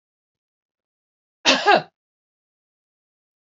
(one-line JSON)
{"cough_length": "3.6 s", "cough_amplitude": 26671, "cough_signal_mean_std_ratio": 0.22, "survey_phase": "beta (2021-08-13 to 2022-03-07)", "age": "45-64", "gender": "Female", "wearing_mask": "No", "symptom_none": true, "smoker_status": "Never smoked", "respiratory_condition_asthma": false, "respiratory_condition_other": false, "recruitment_source": "REACT", "submission_delay": "2 days", "covid_test_result": "Negative", "covid_test_method": "RT-qPCR", "influenza_a_test_result": "Negative", "influenza_b_test_result": "Negative"}